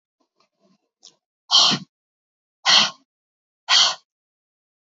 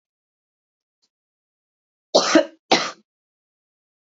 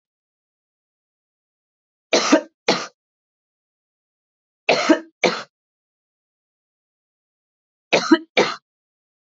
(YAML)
exhalation_length: 4.9 s
exhalation_amplitude: 26063
exhalation_signal_mean_std_ratio: 0.31
cough_length: 4.0 s
cough_amplitude: 28261
cough_signal_mean_std_ratio: 0.24
three_cough_length: 9.2 s
three_cough_amplitude: 28392
three_cough_signal_mean_std_ratio: 0.26
survey_phase: beta (2021-08-13 to 2022-03-07)
age: 18-44
gender: Female
wearing_mask: 'No'
symptom_sore_throat: true
smoker_status: Never smoked
respiratory_condition_asthma: false
respiratory_condition_other: false
recruitment_source: Test and Trace
submission_delay: 1 day
covid_test_result: Positive
covid_test_method: RT-qPCR